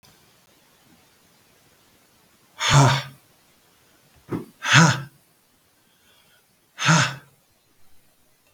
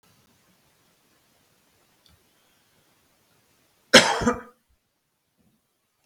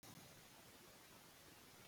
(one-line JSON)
{"exhalation_length": "8.5 s", "exhalation_amplitude": 32766, "exhalation_signal_mean_std_ratio": 0.3, "cough_length": "6.1 s", "cough_amplitude": 32768, "cough_signal_mean_std_ratio": 0.17, "three_cough_length": "1.9 s", "three_cough_amplitude": 128, "three_cough_signal_mean_std_ratio": 1.19, "survey_phase": "beta (2021-08-13 to 2022-03-07)", "age": "45-64", "gender": "Male", "wearing_mask": "No", "symptom_shortness_of_breath": true, "symptom_abdominal_pain": true, "symptom_fatigue": true, "smoker_status": "Ex-smoker", "respiratory_condition_asthma": false, "respiratory_condition_other": false, "recruitment_source": "REACT", "submission_delay": "1 day", "covid_test_result": "Negative", "covid_test_method": "RT-qPCR"}